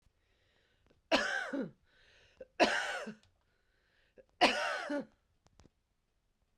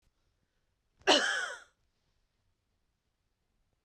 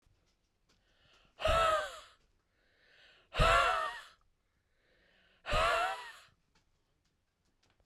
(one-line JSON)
{"three_cough_length": "6.6 s", "three_cough_amplitude": 10352, "three_cough_signal_mean_std_ratio": 0.36, "cough_length": "3.8 s", "cough_amplitude": 11123, "cough_signal_mean_std_ratio": 0.24, "exhalation_length": "7.9 s", "exhalation_amplitude": 6114, "exhalation_signal_mean_std_ratio": 0.37, "survey_phase": "beta (2021-08-13 to 2022-03-07)", "age": "45-64", "gender": "Female", "wearing_mask": "No", "symptom_runny_or_blocked_nose": true, "symptom_sore_throat": true, "symptom_headache": true, "symptom_onset": "12 days", "smoker_status": "Ex-smoker", "respiratory_condition_asthma": false, "respiratory_condition_other": false, "recruitment_source": "REACT", "submission_delay": "2 days", "covid_test_result": "Negative", "covid_test_method": "RT-qPCR", "influenza_a_test_result": "Unknown/Void", "influenza_b_test_result": "Unknown/Void"}